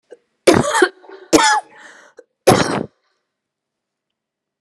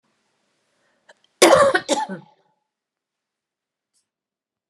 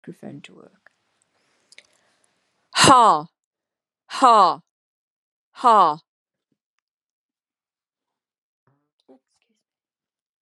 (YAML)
three_cough_length: 4.6 s
three_cough_amplitude: 32768
three_cough_signal_mean_std_ratio: 0.36
cough_length: 4.7 s
cough_amplitude: 32767
cough_signal_mean_std_ratio: 0.26
exhalation_length: 10.4 s
exhalation_amplitude: 31811
exhalation_signal_mean_std_ratio: 0.25
survey_phase: beta (2021-08-13 to 2022-03-07)
age: 65+
gender: Female
wearing_mask: 'No'
symptom_cough_any: true
symptom_runny_or_blocked_nose: true
symptom_fatigue: true
symptom_headache: true
symptom_change_to_sense_of_smell_or_taste: true
symptom_loss_of_taste: true
symptom_onset: 5 days
smoker_status: Never smoked
respiratory_condition_asthma: false
respiratory_condition_other: false
recruitment_source: Test and Trace
submission_delay: 2 days
covid_test_result: Positive
covid_test_method: RT-qPCR
covid_ct_value: 15.3
covid_ct_gene: ORF1ab gene
covid_ct_mean: 15.6
covid_viral_load: 7400000 copies/ml
covid_viral_load_category: High viral load (>1M copies/ml)